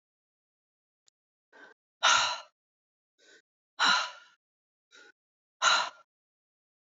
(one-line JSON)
{"exhalation_length": "6.8 s", "exhalation_amplitude": 10217, "exhalation_signal_mean_std_ratio": 0.29, "survey_phase": "alpha (2021-03-01 to 2021-08-12)", "age": "18-44", "gender": "Female", "wearing_mask": "No", "symptom_cough_any": true, "symptom_fatigue": true, "symptom_change_to_sense_of_smell_or_taste": true, "symptom_loss_of_taste": true, "symptom_onset": "6 days", "smoker_status": "Never smoked", "respiratory_condition_asthma": false, "respiratory_condition_other": false, "recruitment_source": "Test and Trace", "submission_delay": "1 day", "covid_test_result": "Positive", "covid_test_method": "RT-qPCR", "covid_ct_value": 20.3, "covid_ct_gene": "N gene", "covid_ct_mean": 20.7, "covid_viral_load": "160000 copies/ml", "covid_viral_load_category": "Low viral load (10K-1M copies/ml)"}